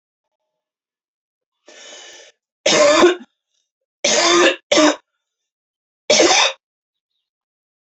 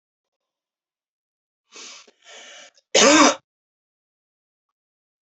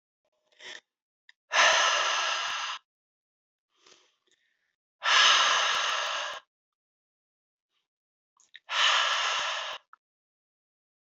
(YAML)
three_cough_length: 7.9 s
three_cough_amplitude: 28579
three_cough_signal_mean_std_ratio: 0.39
cough_length: 5.3 s
cough_amplitude: 32768
cough_signal_mean_std_ratio: 0.23
exhalation_length: 11.0 s
exhalation_amplitude: 12807
exhalation_signal_mean_std_ratio: 0.45
survey_phase: beta (2021-08-13 to 2022-03-07)
age: 18-44
gender: Female
wearing_mask: 'No'
symptom_runny_or_blocked_nose: true
symptom_shortness_of_breath: true
symptom_sore_throat: true
symptom_fatigue: true
symptom_headache: true
smoker_status: Never smoked
respiratory_condition_asthma: false
respiratory_condition_other: false
recruitment_source: Test and Trace
submission_delay: 1 day
covid_test_result: Positive
covid_test_method: RT-qPCR
covid_ct_value: 32.4
covid_ct_gene: ORF1ab gene